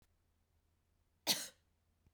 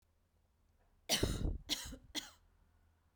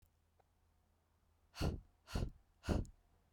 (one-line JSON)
{"cough_length": "2.1 s", "cough_amplitude": 3573, "cough_signal_mean_std_ratio": 0.22, "three_cough_length": "3.2 s", "three_cough_amplitude": 3645, "three_cough_signal_mean_std_ratio": 0.4, "exhalation_length": "3.3 s", "exhalation_amplitude": 2438, "exhalation_signal_mean_std_ratio": 0.34, "survey_phase": "beta (2021-08-13 to 2022-03-07)", "age": "18-44", "gender": "Female", "wearing_mask": "No", "symptom_runny_or_blocked_nose": true, "symptom_sore_throat": true, "symptom_headache": true, "symptom_onset": "6 days", "smoker_status": "Never smoked", "respiratory_condition_asthma": false, "respiratory_condition_other": false, "recruitment_source": "REACT", "submission_delay": "1 day", "covid_test_result": "Negative", "covid_test_method": "RT-qPCR"}